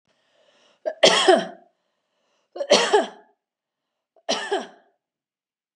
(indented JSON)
{
  "three_cough_length": "5.8 s",
  "three_cough_amplitude": 31185,
  "three_cough_signal_mean_std_ratio": 0.33,
  "survey_phase": "beta (2021-08-13 to 2022-03-07)",
  "age": "45-64",
  "gender": "Female",
  "wearing_mask": "No",
  "symptom_none": true,
  "smoker_status": "Never smoked",
  "respiratory_condition_asthma": false,
  "respiratory_condition_other": false,
  "recruitment_source": "REACT",
  "submission_delay": "1 day",
  "covid_test_result": "Negative",
  "covid_test_method": "RT-qPCR",
  "influenza_a_test_result": "Negative",
  "influenza_b_test_result": "Negative"
}